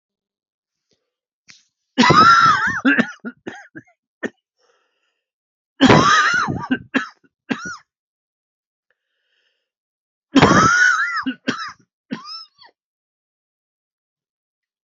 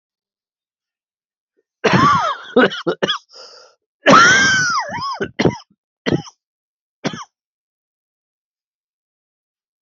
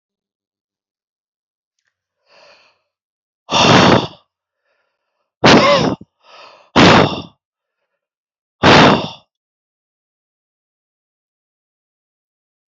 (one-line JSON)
{"three_cough_length": "14.9 s", "three_cough_amplitude": 29075, "three_cough_signal_mean_std_ratio": 0.37, "cough_length": "9.8 s", "cough_amplitude": 29874, "cough_signal_mean_std_ratio": 0.38, "exhalation_length": "12.7 s", "exhalation_amplitude": 32281, "exhalation_signal_mean_std_ratio": 0.32, "survey_phase": "beta (2021-08-13 to 2022-03-07)", "age": "45-64", "gender": "Male", "wearing_mask": "No", "symptom_cough_any": true, "symptom_runny_or_blocked_nose": true, "symptom_sore_throat": true, "symptom_fatigue": true, "symptom_fever_high_temperature": true, "symptom_headache": true, "symptom_onset": "3 days", "smoker_status": "Never smoked", "respiratory_condition_asthma": false, "respiratory_condition_other": false, "recruitment_source": "Test and Trace", "submission_delay": "1 day", "covid_test_result": "Positive", "covid_test_method": "RT-qPCR", "covid_ct_value": 16.4, "covid_ct_gene": "ORF1ab gene", "covid_ct_mean": 16.8, "covid_viral_load": "3000000 copies/ml", "covid_viral_load_category": "High viral load (>1M copies/ml)"}